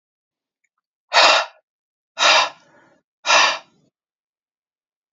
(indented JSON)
{
  "exhalation_length": "5.1 s",
  "exhalation_amplitude": 30350,
  "exhalation_signal_mean_std_ratio": 0.34,
  "survey_phase": "beta (2021-08-13 to 2022-03-07)",
  "age": "18-44",
  "gender": "Female",
  "wearing_mask": "No",
  "symptom_cough_any": true,
  "symptom_runny_or_blocked_nose": true,
  "symptom_change_to_sense_of_smell_or_taste": true,
  "symptom_onset": "12 days",
  "smoker_status": "Never smoked",
  "respiratory_condition_asthma": true,
  "respiratory_condition_other": false,
  "recruitment_source": "REACT",
  "submission_delay": "1 day",
  "covid_test_result": "Negative",
  "covid_test_method": "RT-qPCR",
  "influenza_a_test_result": "Negative",
  "influenza_b_test_result": "Negative"
}